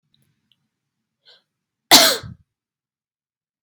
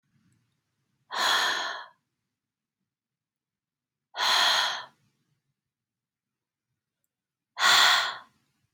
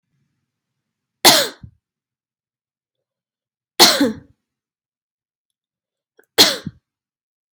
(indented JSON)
{
  "cough_length": "3.6 s",
  "cough_amplitude": 32768,
  "cough_signal_mean_std_ratio": 0.2,
  "exhalation_length": "8.7 s",
  "exhalation_amplitude": 13466,
  "exhalation_signal_mean_std_ratio": 0.35,
  "three_cough_length": "7.5 s",
  "three_cough_amplitude": 32768,
  "three_cough_signal_mean_std_ratio": 0.23,
  "survey_phase": "alpha (2021-03-01 to 2021-08-12)",
  "age": "18-44",
  "gender": "Female",
  "wearing_mask": "No",
  "symptom_none": true,
  "smoker_status": "Never smoked",
  "respiratory_condition_asthma": false,
  "respiratory_condition_other": false,
  "recruitment_source": "REACT",
  "submission_delay": "2 days",
  "covid_test_result": "Negative",
  "covid_test_method": "RT-qPCR"
}